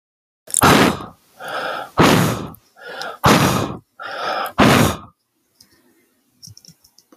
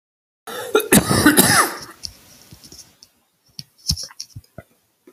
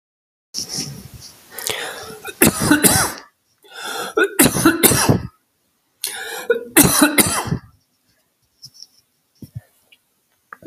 exhalation_length: 7.2 s
exhalation_amplitude: 32768
exhalation_signal_mean_std_ratio: 0.46
cough_length: 5.1 s
cough_amplitude: 32768
cough_signal_mean_std_ratio: 0.37
three_cough_length: 10.7 s
three_cough_amplitude: 32768
three_cough_signal_mean_std_ratio: 0.43
survey_phase: beta (2021-08-13 to 2022-03-07)
age: 18-44
gender: Male
wearing_mask: 'No'
symptom_cough_any: true
symptom_new_continuous_cough: true
symptom_shortness_of_breath: true
symptom_change_to_sense_of_smell_or_taste: true
symptom_onset: 12 days
smoker_status: Never smoked
respiratory_condition_asthma: true
respiratory_condition_other: false
recruitment_source: REACT
submission_delay: 2 days
covid_test_result: Negative
covid_test_method: RT-qPCR
influenza_a_test_result: Unknown/Void
influenza_b_test_result: Unknown/Void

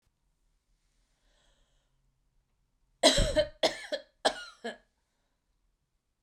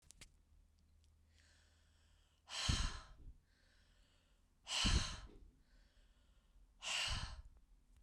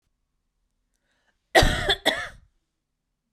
three_cough_length: 6.2 s
three_cough_amplitude: 15040
three_cough_signal_mean_std_ratio: 0.26
exhalation_length: 8.0 s
exhalation_amplitude: 2372
exhalation_signal_mean_std_ratio: 0.38
cough_length: 3.3 s
cough_amplitude: 30405
cough_signal_mean_std_ratio: 0.29
survey_phase: beta (2021-08-13 to 2022-03-07)
age: 45-64
gender: Female
wearing_mask: 'No'
symptom_none: true
smoker_status: Ex-smoker
respiratory_condition_asthma: false
respiratory_condition_other: false
recruitment_source: REACT
submission_delay: 1 day
covid_test_result: Negative
covid_test_method: RT-qPCR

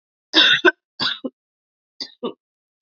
three_cough_length: 2.8 s
three_cough_amplitude: 28221
three_cough_signal_mean_std_ratio: 0.34
survey_phase: beta (2021-08-13 to 2022-03-07)
age: 18-44
gender: Female
wearing_mask: 'No'
symptom_cough_any: true
symptom_sore_throat: true
symptom_abdominal_pain: true
symptom_fatigue: true
symptom_change_to_sense_of_smell_or_taste: true
symptom_loss_of_taste: true
symptom_onset: 2 days
smoker_status: Never smoked
respiratory_condition_asthma: false
respiratory_condition_other: false
recruitment_source: Test and Trace
submission_delay: 2 days
covid_test_result: Positive
covid_test_method: RT-qPCR
covid_ct_value: 20.1
covid_ct_gene: ORF1ab gene
covid_ct_mean: 20.6
covid_viral_load: 170000 copies/ml
covid_viral_load_category: Low viral load (10K-1M copies/ml)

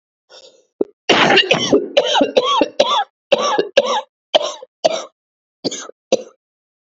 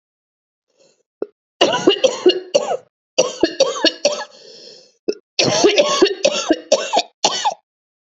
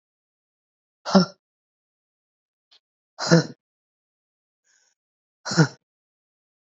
cough_length: 6.8 s
cough_amplitude: 32767
cough_signal_mean_std_ratio: 0.5
three_cough_length: 8.1 s
three_cough_amplitude: 32768
three_cough_signal_mean_std_ratio: 0.49
exhalation_length: 6.7 s
exhalation_amplitude: 26781
exhalation_signal_mean_std_ratio: 0.21
survey_phase: beta (2021-08-13 to 2022-03-07)
age: 45-64
gender: Female
wearing_mask: 'No'
symptom_cough_any: true
symptom_runny_or_blocked_nose: true
symptom_shortness_of_breath: true
symptom_sore_throat: true
symptom_other: true
symptom_onset: 4 days
smoker_status: Never smoked
respiratory_condition_asthma: false
respiratory_condition_other: false
recruitment_source: Test and Trace
submission_delay: 1 day
covid_test_result: Positive
covid_test_method: RT-qPCR
covid_ct_value: 24.1
covid_ct_gene: ORF1ab gene
covid_ct_mean: 24.7
covid_viral_load: 7600 copies/ml
covid_viral_load_category: Minimal viral load (< 10K copies/ml)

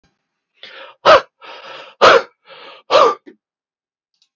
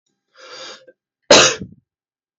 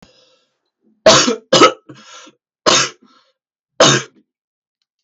exhalation_length: 4.4 s
exhalation_amplitude: 32768
exhalation_signal_mean_std_ratio: 0.32
cough_length: 2.4 s
cough_amplitude: 32768
cough_signal_mean_std_ratio: 0.28
three_cough_length: 5.0 s
three_cough_amplitude: 32768
three_cough_signal_mean_std_ratio: 0.35
survey_phase: beta (2021-08-13 to 2022-03-07)
age: 18-44
gender: Male
wearing_mask: 'No'
symptom_none: true
smoker_status: Never smoked
respiratory_condition_asthma: false
respiratory_condition_other: false
recruitment_source: REACT
submission_delay: 2 days
covid_test_result: Negative
covid_test_method: RT-qPCR
influenza_a_test_result: Negative
influenza_b_test_result: Negative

